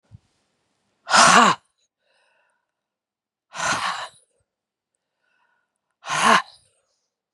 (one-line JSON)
{"exhalation_length": "7.3 s", "exhalation_amplitude": 30593, "exhalation_signal_mean_std_ratio": 0.29, "survey_phase": "beta (2021-08-13 to 2022-03-07)", "age": "65+", "gender": "Female", "wearing_mask": "No", "symptom_loss_of_taste": true, "smoker_status": "Never smoked", "respiratory_condition_asthma": true, "respiratory_condition_other": false, "recruitment_source": "REACT", "submission_delay": "1 day", "covid_test_result": "Negative", "covid_test_method": "RT-qPCR", "influenza_a_test_result": "Negative", "influenza_b_test_result": "Negative"}